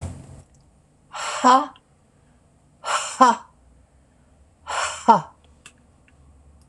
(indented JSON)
{
  "exhalation_length": "6.7 s",
  "exhalation_amplitude": 26028,
  "exhalation_signal_mean_std_ratio": 0.31,
  "survey_phase": "beta (2021-08-13 to 2022-03-07)",
  "age": "65+",
  "gender": "Female",
  "wearing_mask": "No",
  "symptom_cough_any": true,
  "symptom_fatigue": true,
  "symptom_onset": "12 days",
  "smoker_status": "Never smoked",
  "respiratory_condition_asthma": true,
  "respiratory_condition_other": false,
  "recruitment_source": "REACT",
  "submission_delay": "2 days",
  "covid_test_result": "Negative",
  "covid_test_method": "RT-qPCR",
  "influenza_a_test_result": "Negative",
  "influenza_b_test_result": "Negative"
}